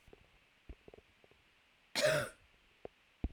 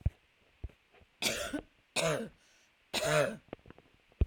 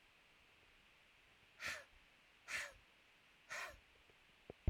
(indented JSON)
{
  "cough_length": "3.3 s",
  "cough_amplitude": 3557,
  "cough_signal_mean_std_ratio": 0.3,
  "three_cough_length": "4.3 s",
  "three_cough_amplitude": 5609,
  "three_cough_signal_mean_std_ratio": 0.42,
  "exhalation_length": "4.7 s",
  "exhalation_amplitude": 1765,
  "exhalation_signal_mean_std_ratio": 0.33,
  "survey_phase": "beta (2021-08-13 to 2022-03-07)",
  "age": "18-44",
  "gender": "Female",
  "wearing_mask": "No",
  "symptom_diarrhoea": true,
  "symptom_headache": true,
  "symptom_change_to_sense_of_smell_or_taste": true,
  "symptom_loss_of_taste": true,
  "symptom_onset": "12 days",
  "smoker_status": "Never smoked",
  "respiratory_condition_asthma": false,
  "respiratory_condition_other": false,
  "recruitment_source": "REACT",
  "submission_delay": "2 days",
  "covid_test_result": "Negative",
  "covid_test_method": "RT-qPCR",
  "influenza_a_test_result": "Negative",
  "influenza_b_test_result": "Negative"
}